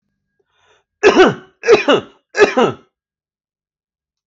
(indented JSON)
{
  "three_cough_length": "4.3 s",
  "three_cough_amplitude": 32768,
  "three_cough_signal_mean_std_ratio": 0.37,
  "survey_phase": "alpha (2021-03-01 to 2021-08-12)",
  "age": "45-64",
  "gender": "Male",
  "wearing_mask": "No",
  "symptom_none": true,
  "smoker_status": "Never smoked",
  "respiratory_condition_asthma": false,
  "respiratory_condition_other": false,
  "recruitment_source": "REACT",
  "submission_delay": "1 day",
  "covid_test_result": "Negative",
  "covid_test_method": "RT-qPCR"
}